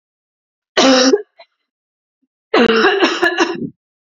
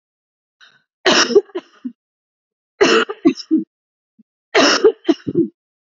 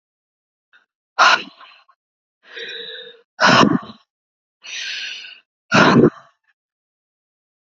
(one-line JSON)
{"cough_length": "4.0 s", "cough_amplitude": 31508, "cough_signal_mean_std_ratio": 0.51, "three_cough_length": "5.8 s", "three_cough_amplitude": 32767, "three_cough_signal_mean_std_ratio": 0.4, "exhalation_length": "7.8 s", "exhalation_amplitude": 31915, "exhalation_signal_mean_std_ratio": 0.33, "survey_phase": "beta (2021-08-13 to 2022-03-07)", "age": "18-44", "gender": "Female", "wearing_mask": "No", "symptom_none": true, "smoker_status": "Never smoked", "respiratory_condition_asthma": false, "respiratory_condition_other": false, "recruitment_source": "REACT", "submission_delay": "0 days", "covid_test_result": "Negative", "covid_test_method": "RT-qPCR"}